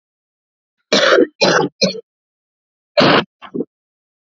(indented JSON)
{
  "cough_length": "4.3 s",
  "cough_amplitude": 31632,
  "cough_signal_mean_std_ratio": 0.41,
  "survey_phase": "alpha (2021-03-01 to 2021-08-12)",
  "age": "18-44",
  "gender": "Female",
  "wearing_mask": "No",
  "symptom_new_continuous_cough": true,
  "symptom_shortness_of_breath": true,
  "symptom_diarrhoea": true,
  "symptom_headache": true,
  "symptom_change_to_sense_of_smell_or_taste": true,
  "symptom_loss_of_taste": true,
  "symptom_onset": "6 days",
  "smoker_status": "Current smoker (11 or more cigarettes per day)",
  "respiratory_condition_asthma": false,
  "respiratory_condition_other": false,
  "recruitment_source": "Test and Trace",
  "submission_delay": "3 days",
  "covid_test_result": "Positive",
  "covid_test_method": "RT-qPCR",
  "covid_ct_value": 27.8,
  "covid_ct_gene": "ORF1ab gene"
}